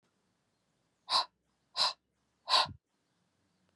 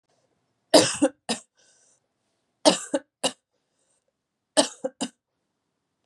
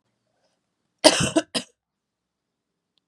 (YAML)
exhalation_length: 3.8 s
exhalation_amplitude: 7067
exhalation_signal_mean_std_ratio: 0.28
three_cough_length: 6.1 s
three_cough_amplitude: 28238
three_cough_signal_mean_std_ratio: 0.25
cough_length: 3.1 s
cough_amplitude: 32767
cough_signal_mean_std_ratio: 0.23
survey_phase: beta (2021-08-13 to 2022-03-07)
age: 18-44
gender: Female
wearing_mask: 'No'
symptom_cough_any: true
symptom_runny_or_blocked_nose: true
symptom_sore_throat: true
symptom_fatigue: true
symptom_headache: true
symptom_change_to_sense_of_smell_or_taste: true
symptom_other: true
symptom_onset: 2 days
smoker_status: Ex-smoker
respiratory_condition_asthma: false
respiratory_condition_other: false
recruitment_source: REACT
submission_delay: 1 day
covid_test_result: Positive
covid_test_method: RT-qPCR
covid_ct_value: 30.0
covid_ct_gene: E gene
influenza_a_test_result: Negative
influenza_b_test_result: Negative